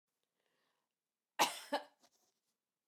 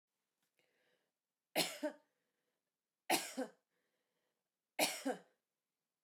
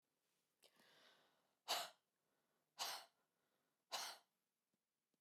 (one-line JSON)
{"cough_length": "2.9 s", "cough_amplitude": 4033, "cough_signal_mean_std_ratio": 0.21, "three_cough_length": "6.0 s", "three_cough_amplitude": 3692, "three_cough_signal_mean_std_ratio": 0.28, "exhalation_length": "5.2 s", "exhalation_amplitude": 1011, "exhalation_signal_mean_std_ratio": 0.29, "survey_phase": "beta (2021-08-13 to 2022-03-07)", "age": "45-64", "gender": "Female", "wearing_mask": "No", "symptom_none": true, "symptom_onset": "12 days", "smoker_status": "Never smoked", "respiratory_condition_asthma": false, "respiratory_condition_other": false, "recruitment_source": "REACT", "submission_delay": "1 day", "covid_test_result": "Negative", "covid_test_method": "RT-qPCR"}